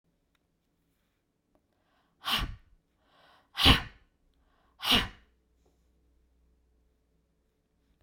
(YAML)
exhalation_length: 8.0 s
exhalation_amplitude: 15501
exhalation_signal_mean_std_ratio: 0.22
survey_phase: beta (2021-08-13 to 2022-03-07)
age: 65+
gender: Female
wearing_mask: 'No'
symptom_none: true
smoker_status: Never smoked
respiratory_condition_asthma: false
respiratory_condition_other: false
recruitment_source: REACT
submission_delay: 2 days
covid_test_result: Negative
covid_test_method: RT-qPCR